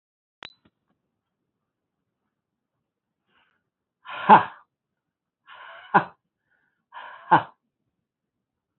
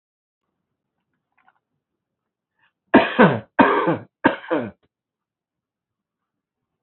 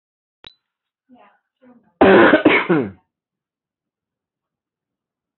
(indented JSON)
{
  "exhalation_length": "8.8 s",
  "exhalation_amplitude": 24703,
  "exhalation_signal_mean_std_ratio": 0.16,
  "three_cough_length": "6.8 s",
  "three_cough_amplitude": 26401,
  "three_cough_signal_mean_std_ratio": 0.28,
  "cough_length": "5.4 s",
  "cough_amplitude": 27413,
  "cough_signal_mean_std_ratio": 0.3,
  "survey_phase": "beta (2021-08-13 to 2022-03-07)",
  "age": "45-64",
  "gender": "Male",
  "wearing_mask": "No",
  "symptom_none": true,
  "symptom_onset": "9 days",
  "smoker_status": "Ex-smoker",
  "respiratory_condition_asthma": false,
  "respiratory_condition_other": false,
  "recruitment_source": "REACT",
  "submission_delay": "1 day",
  "covid_test_result": "Negative",
  "covid_test_method": "RT-qPCR",
  "influenza_a_test_result": "Negative",
  "influenza_b_test_result": "Negative"
}